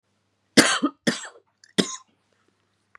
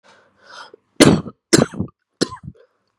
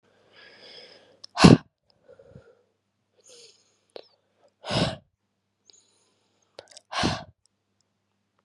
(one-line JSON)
{"three_cough_length": "3.0 s", "three_cough_amplitude": 32767, "three_cough_signal_mean_std_ratio": 0.28, "cough_length": "3.0 s", "cough_amplitude": 32768, "cough_signal_mean_std_ratio": 0.29, "exhalation_length": "8.4 s", "exhalation_amplitude": 32485, "exhalation_signal_mean_std_ratio": 0.18, "survey_phase": "beta (2021-08-13 to 2022-03-07)", "age": "18-44", "gender": "Female", "wearing_mask": "No", "symptom_cough_any": true, "symptom_runny_or_blocked_nose": true, "symptom_shortness_of_breath": true, "symptom_sore_throat": true, "symptom_fatigue": true, "symptom_fever_high_temperature": true, "symptom_headache": true, "symptom_other": true, "smoker_status": "Current smoker (11 or more cigarettes per day)", "respiratory_condition_asthma": true, "respiratory_condition_other": false, "recruitment_source": "Test and Trace", "submission_delay": "2 days", "covid_test_result": "Positive", "covid_test_method": "RT-qPCR", "covid_ct_value": 14.7, "covid_ct_gene": "ORF1ab gene", "covid_ct_mean": 14.9, "covid_viral_load": "13000000 copies/ml", "covid_viral_load_category": "High viral load (>1M copies/ml)"}